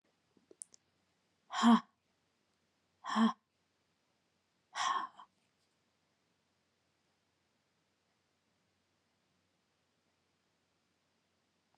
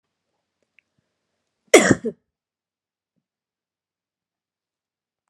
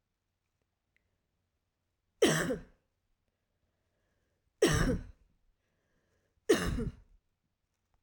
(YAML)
exhalation_length: 11.8 s
exhalation_amplitude: 5014
exhalation_signal_mean_std_ratio: 0.2
cough_length: 5.3 s
cough_amplitude: 32768
cough_signal_mean_std_ratio: 0.15
three_cough_length: 8.0 s
three_cough_amplitude: 6504
three_cough_signal_mean_std_ratio: 0.29
survey_phase: beta (2021-08-13 to 2022-03-07)
age: 45-64
gender: Female
wearing_mask: 'No'
symptom_runny_or_blocked_nose: true
symptom_abdominal_pain: true
symptom_fatigue: true
symptom_change_to_sense_of_smell_or_taste: true
symptom_loss_of_taste: true
symptom_onset: 3 days
smoker_status: Never smoked
respiratory_condition_asthma: false
respiratory_condition_other: false
recruitment_source: Test and Trace
submission_delay: 1 day
covid_test_result: Positive
covid_test_method: RT-qPCR
covid_ct_value: 17.9
covid_ct_gene: ORF1ab gene